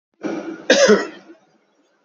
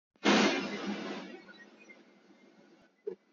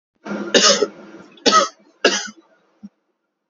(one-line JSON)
{"cough_length": "2.0 s", "cough_amplitude": 29193, "cough_signal_mean_std_ratio": 0.41, "exhalation_length": "3.3 s", "exhalation_amplitude": 6501, "exhalation_signal_mean_std_ratio": 0.42, "three_cough_length": "3.5 s", "three_cough_amplitude": 31656, "three_cough_signal_mean_std_ratio": 0.4, "survey_phase": "beta (2021-08-13 to 2022-03-07)", "age": "18-44", "gender": "Male", "wearing_mask": "No", "symptom_none": true, "smoker_status": "Current smoker (1 to 10 cigarettes per day)", "respiratory_condition_asthma": true, "respiratory_condition_other": false, "recruitment_source": "REACT", "submission_delay": "1 day", "covid_test_result": "Negative", "covid_test_method": "RT-qPCR", "influenza_a_test_result": "Negative", "influenza_b_test_result": "Negative"}